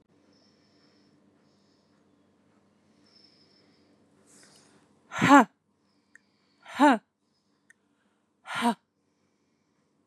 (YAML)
exhalation_length: 10.1 s
exhalation_amplitude: 26157
exhalation_signal_mean_std_ratio: 0.18
survey_phase: beta (2021-08-13 to 2022-03-07)
age: 18-44
gender: Female
wearing_mask: 'No'
symptom_none: true
smoker_status: Ex-smoker
respiratory_condition_asthma: false
respiratory_condition_other: false
recruitment_source: Test and Trace
submission_delay: 2 days
covid_test_result: Positive
covid_test_method: RT-qPCR
covid_ct_value: 35.6
covid_ct_gene: N gene